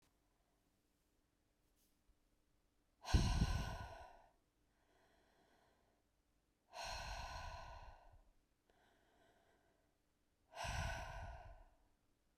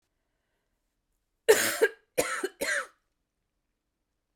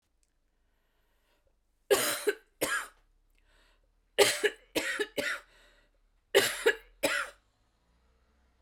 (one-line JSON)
{"exhalation_length": "12.4 s", "exhalation_amplitude": 2771, "exhalation_signal_mean_std_ratio": 0.33, "cough_length": "4.4 s", "cough_amplitude": 15666, "cough_signal_mean_std_ratio": 0.3, "three_cough_length": "8.6 s", "three_cough_amplitude": 15952, "three_cough_signal_mean_std_ratio": 0.35, "survey_phase": "beta (2021-08-13 to 2022-03-07)", "age": "45-64", "gender": "Female", "wearing_mask": "No", "symptom_cough_any": true, "symptom_runny_or_blocked_nose": true, "symptom_shortness_of_breath": true, "symptom_sore_throat": true, "symptom_fatigue": true, "symptom_headache": true, "symptom_onset": "5 days", "smoker_status": "Never smoked", "respiratory_condition_asthma": false, "respiratory_condition_other": false, "recruitment_source": "Test and Trace", "submission_delay": "2 days", "covid_test_result": "Positive", "covid_test_method": "RT-qPCR", "covid_ct_value": 20.1, "covid_ct_gene": "ORF1ab gene", "covid_ct_mean": 21.3, "covid_viral_load": "99000 copies/ml", "covid_viral_load_category": "Low viral load (10K-1M copies/ml)"}